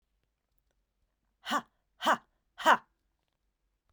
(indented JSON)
{
  "exhalation_length": "3.9 s",
  "exhalation_amplitude": 11687,
  "exhalation_signal_mean_std_ratio": 0.23,
  "survey_phase": "beta (2021-08-13 to 2022-03-07)",
  "age": "45-64",
  "gender": "Female",
  "wearing_mask": "No",
  "symptom_cough_any": true,
  "symptom_runny_or_blocked_nose": true,
  "symptom_sore_throat": true,
  "symptom_fatigue": true,
  "symptom_fever_high_temperature": true,
  "symptom_headache": true,
  "smoker_status": "Never smoked",
  "respiratory_condition_asthma": false,
  "respiratory_condition_other": false,
  "recruitment_source": "Test and Trace",
  "submission_delay": "1 day",
  "covid_test_result": "Positive",
  "covid_test_method": "RT-qPCR",
  "covid_ct_value": 23.6,
  "covid_ct_gene": "ORF1ab gene",
  "covid_ct_mean": 24.0,
  "covid_viral_load": "14000 copies/ml",
  "covid_viral_load_category": "Low viral load (10K-1M copies/ml)"
}